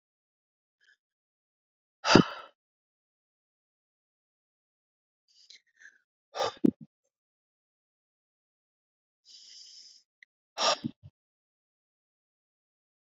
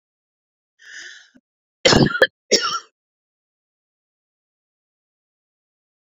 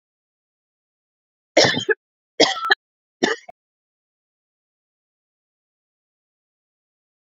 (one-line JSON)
{"exhalation_length": "13.1 s", "exhalation_amplitude": 27861, "exhalation_signal_mean_std_ratio": 0.15, "cough_length": "6.1 s", "cough_amplitude": 32048, "cough_signal_mean_std_ratio": 0.23, "three_cough_length": "7.3 s", "three_cough_amplitude": 29023, "three_cough_signal_mean_std_ratio": 0.22, "survey_phase": "beta (2021-08-13 to 2022-03-07)", "age": "45-64", "gender": "Female", "wearing_mask": "No", "symptom_none": true, "smoker_status": "Never smoked", "respiratory_condition_asthma": false, "respiratory_condition_other": false, "recruitment_source": "REACT", "submission_delay": "1 day", "covid_test_result": "Negative", "covid_test_method": "RT-qPCR"}